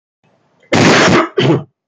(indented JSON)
{
  "cough_length": "1.9 s",
  "cough_amplitude": 32767,
  "cough_signal_mean_std_ratio": 0.61,
  "survey_phase": "beta (2021-08-13 to 2022-03-07)",
  "age": "45-64",
  "gender": "Male",
  "wearing_mask": "No",
  "symptom_cough_any": true,
  "symptom_sore_throat": true,
  "symptom_onset": "2 days",
  "smoker_status": "Never smoked",
  "respiratory_condition_asthma": true,
  "respiratory_condition_other": false,
  "recruitment_source": "REACT",
  "submission_delay": "0 days",
  "covid_test_result": "Negative",
  "covid_test_method": "RT-qPCR",
  "covid_ct_value": 46.0,
  "covid_ct_gene": "N gene"
}